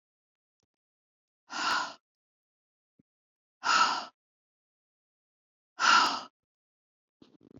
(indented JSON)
{
  "exhalation_length": "7.6 s",
  "exhalation_amplitude": 9983,
  "exhalation_signal_mean_std_ratio": 0.29,
  "survey_phase": "beta (2021-08-13 to 2022-03-07)",
  "age": "45-64",
  "gender": "Female",
  "wearing_mask": "No",
  "symptom_sore_throat": true,
  "smoker_status": "Never smoked",
  "respiratory_condition_asthma": false,
  "respiratory_condition_other": false,
  "recruitment_source": "REACT",
  "submission_delay": "1 day",
  "covid_test_result": "Negative",
  "covid_test_method": "RT-qPCR"
}